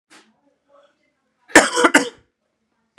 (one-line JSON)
{"cough_length": "3.0 s", "cough_amplitude": 32768, "cough_signal_mean_std_ratio": 0.26, "survey_phase": "beta (2021-08-13 to 2022-03-07)", "age": "18-44", "gender": "Male", "wearing_mask": "No", "symptom_cough_any": true, "symptom_sore_throat": true, "symptom_fatigue": true, "symptom_fever_high_temperature": true, "symptom_headache": true, "smoker_status": "Never smoked", "respiratory_condition_asthma": false, "respiratory_condition_other": false, "recruitment_source": "Test and Trace", "submission_delay": "2 days", "covid_test_result": "Positive", "covid_test_method": "RT-qPCR", "covid_ct_value": 23.4, "covid_ct_gene": "S gene"}